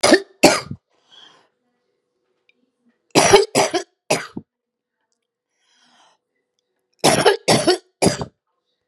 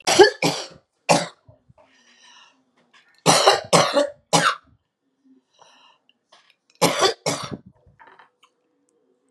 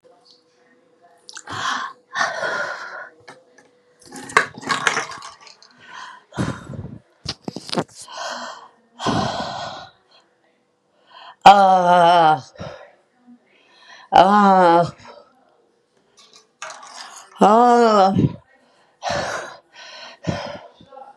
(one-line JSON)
{"cough_length": "8.9 s", "cough_amplitude": 32768, "cough_signal_mean_std_ratio": 0.33, "three_cough_length": "9.3 s", "three_cough_amplitude": 32751, "three_cough_signal_mean_std_ratio": 0.34, "exhalation_length": "21.2 s", "exhalation_amplitude": 32768, "exhalation_signal_mean_std_ratio": 0.39, "survey_phase": "beta (2021-08-13 to 2022-03-07)", "age": "45-64", "gender": "Female", "wearing_mask": "No", "symptom_new_continuous_cough": true, "symptom_diarrhoea": true, "symptom_fatigue": true, "symptom_fever_high_temperature": true, "symptom_onset": "4 days", "smoker_status": "Ex-smoker", "respiratory_condition_asthma": true, "respiratory_condition_other": false, "recruitment_source": "Test and Trace", "submission_delay": "2 days", "covid_test_result": "Positive", "covid_test_method": "ePCR"}